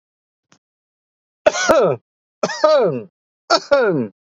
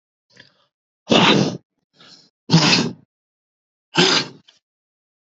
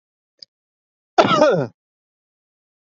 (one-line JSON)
{"three_cough_length": "4.3 s", "three_cough_amplitude": 30598, "three_cough_signal_mean_std_ratio": 0.47, "exhalation_length": "5.4 s", "exhalation_amplitude": 29710, "exhalation_signal_mean_std_ratio": 0.37, "cough_length": "2.8 s", "cough_amplitude": 30758, "cough_signal_mean_std_ratio": 0.32, "survey_phase": "beta (2021-08-13 to 2022-03-07)", "age": "18-44", "gender": "Male", "wearing_mask": "Yes", "symptom_none": true, "smoker_status": "Never smoked", "respiratory_condition_asthma": false, "respiratory_condition_other": false, "recruitment_source": "REACT", "submission_delay": "2 days", "covid_test_result": "Negative", "covid_test_method": "RT-qPCR", "influenza_a_test_result": "Negative", "influenza_b_test_result": "Negative"}